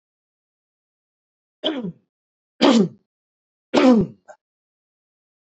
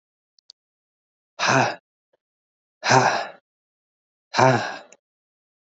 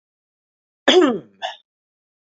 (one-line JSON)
{"three_cough_length": "5.5 s", "three_cough_amplitude": 27147, "three_cough_signal_mean_std_ratio": 0.3, "exhalation_length": "5.7 s", "exhalation_amplitude": 27129, "exhalation_signal_mean_std_ratio": 0.33, "cough_length": "2.2 s", "cough_amplitude": 27348, "cough_signal_mean_std_ratio": 0.31, "survey_phase": "beta (2021-08-13 to 2022-03-07)", "age": "18-44", "gender": "Male", "wearing_mask": "No", "symptom_none": true, "smoker_status": "Never smoked", "respiratory_condition_asthma": false, "respiratory_condition_other": false, "recruitment_source": "Test and Trace", "submission_delay": "2 days", "covid_test_result": "Negative", "covid_test_method": "RT-qPCR"}